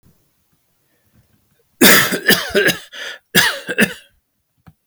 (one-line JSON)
{"cough_length": "4.9 s", "cough_amplitude": 32768, "cough_signal_mean_std_ratio": 0.39, "survey_phase": "beta (2021-08-13 to 2022-03-07)", "age": "65+", "gender": "Male", "wearing_mask": "No", "symptom_none": true, "smoker_status": "Never smoked", "respiratory_condition_asthma": false, "respiratory_condition_other": false, "recruitment_source": "REACT", "submission_delay": "2 days", "covid_test_result": "Negative", "covid_test_method": "RT-qPCR"}